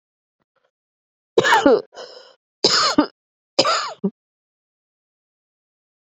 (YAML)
three_cough_length: 6.1 s
three_cough_amplitude: 31557
three_cough_signal_mean_std_ratio: 0.34
survey_phase: beta (2021-08-13 to 2022-03-07)
age: 65+
gender: Female
wearing_mask: 'No'
symptom_runny_or_blocked_nose: true
symptom_headache: true
symptom_other: true
smoker_status: Ex-smoker
respiratory_condition_asthma: false
respiratory_condition_other: false
recruitment_source: Test and Trace
submission_delay: 2 days
covid_test_result: Positive
covid_test_method: RT-qPCR
covid_ct_value: 33.6
covid_ct_gene: N gene